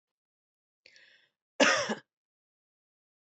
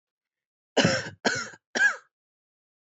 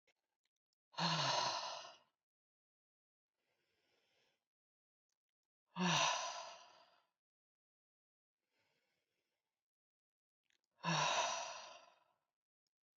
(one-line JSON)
{"cough_length": "3.3 s", "cough_amplitude": 10957, "cough_signal_mean_std_ratio": 0.23, "three_cough_length": "2.8 s", "three_cough_amplitude": 12893, "three_cough_signal_mean_std_ratio": 0.38, "exhalation_length": "13.0 s", "exhalation_amplitude": 2162, "exhalation_signal_mean_std_ratio": 0.34, "survey_phase": "beta (2021-08-13 to 2022-03-07)", "age": "18-44", "gender": "Female", "wearing_mask": "No", "symptom_none": true, "smoker_status": "Never smoked", "respiratory_condition_asthma": false, "respiratory_condition_other": false, "recruitment_source": "REACT", "submission_delay": "2 days", "covid_test_result": "Negative", "covid_test_method": "RT-qPCR", "influenza_a_test_result": "Negative", "influenza_b_test_result": "Negative"}